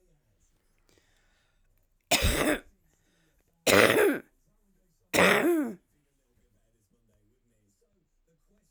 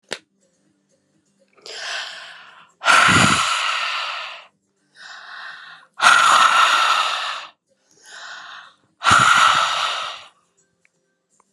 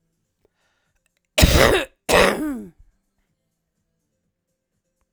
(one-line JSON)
{"three_cough_length": "8.7 s", "three_cough_amplitude": 20543, "three_cough_signal_mean_std_ratio": 0.33, "exhalation_length": "11.5 s", "exhalation_amplitude": 32767, "exhalation_signal_mean_std_ratio": 0.49, "cough_length": "5.1 s", "cough_amplitude": 32768, "cough_signal_mean_std_ratio": 0.32, "survey_phase": "alpha (2021-03-01 to 2021-08-12)", "age": "45-64", "gender": "Female", "wearing_mask": "No", "symptom_none": true, "symptom_fatigue": true, "symptom_onset": "12 days", "smoker_status": "Never smoked", "respiratory_condition_asthma": false, "respiratory_condition_other": false, "recruitment_source": "REACT", "submission_delay": "5 days", "covid_test_result": "Negative", "covid_test_method": "RT-qPCR"}